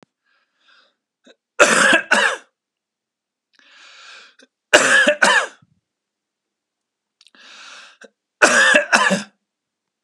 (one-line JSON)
{"three_cough_length": "10.0 s", "three_cough_amplitude": 32768, "three_cough_signal_mean_std_ratio": 0.37, "survey_phase": "beta (2021-08-13 to 2022-03-07)", "age": "45-64", "gender": "Male", "wearing_mask": "No", "symptom_cough_any": true, "smoker_status": "Never smoked", "respiratory_condition_asthma": false, "respiratory_condition_other": false, "recruitment_source": "Test and Trace", "submission_delay": "2 days", "covid_test_result": "Positive", "covid_test_method": "RT-qPCR"}